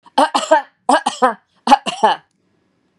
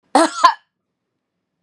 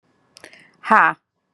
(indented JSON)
{
  "three_cough_length": "3.0 s",
  "three_cough_amplitude": 32768,
  "three_cough_signal_mean_std_ratio": 0.43,
  "cough_length": "1.6 s",
  "cough_amplitude": 32768,
  "cough_signal_mean_std_ratio": 0.31,
  "exhalation_length": "1.5 s",
  "exhalation_amplitude": 31806,
  "exhalation_signal_mean_std_ratio": 0.28,
  "survey_phase": "beta (2021-08-13 to 2022-03-07)",
  "age": "45-64",
  "gender": "Female",
  "wearing_mask": "No",
  "symptom_none": true,
  "smoker_status": "Ex-smoker",
  "respiratory_condition_asthma": false,
  "respiratory_condition_other": false,
  "recruitment_source": "Test and Trace",
  "submission_delay": "2 days",
  "covid_test_result": "Negative",
  "covid_test_method": "RT-qPCR"
}